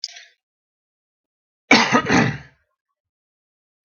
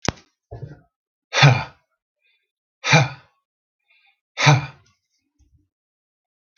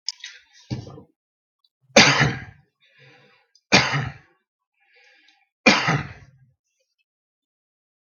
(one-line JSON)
{"cough_length": "3.8 s", "cough_amplitude": 32768, "cough_signal_mean_std_ratio": 0.3, "exhalation_length": "6.6 s", "exhalation_amplitude": 32768, "exhalation_signal_mean_std_ratio": 0.27, "three_cough_length": "8.2 s", "three_cough_amplitude": 32768, "three_cough_signal_mean_std_ratio": 0.28, "survey_phase": "beta (2021-08-13 to 2022-03-07)", "age": "45-64", "gender": "Male", "wearing_mask": "No", "symptom_none": true, "smoker_status": "Never smoked", "respiratory_condition_asthma": false, "respiratory_condition_other": false, "recruitment_source": "REACT", "submission_delay": "2 days", "covid_test_result": "Negative", "covid_test_method": "RT-qPCR"}